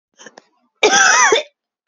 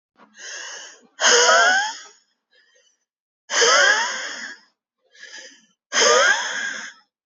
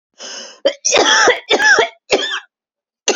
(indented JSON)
{
  "cough_length": "1.9 s",
  "cough_amplitude": 30298,
  "cough_signal_mean_std_ratio": 0.49,
  "exhalation_length": "7.3 s",
  "exhalation_amplitude": 25212,
  "exhalation_signal_mean_std_ratio": 0.49,
  "three_cough_length": "3.2 s",
  "three_cough_amplitude": 32615,
  "three_cough_signal_mean_std_ratio": 0.56,
  "survey_phase": "beta (2021-08-13 to 2022-03-07)",
  "age": "18-44",
  "gender": "Female",
  "wearing_mask": "No",
  "symptom_cough_any": true,
  "symptom_runny_or_blocked_nose": true,
  "symptom_shortness_of_breath": true,
  "symptom_sore_throat": true,
  "symptom_abdominal_pain": true,
  "symptom_fatigue": true,
  "symptom_fever_high_temperature": true,
  "symptom_headache": true,
  "symptom_change_to_sense_of_smell_or_taste": true,
  "symptom_loss_of_taste": true,
  "symptom_onset": "3 days",
  "smoker_status": "Ex-smoker",
  "respiratory_condition_asthma": false,
  "respiratory_condition_other": false,
  "recruitment_source": "Test and Trace",
  "submission_delay": "2 days",
  "covid_test_result": "Positive",
  "covid_test_method": "RT-qPCR"
}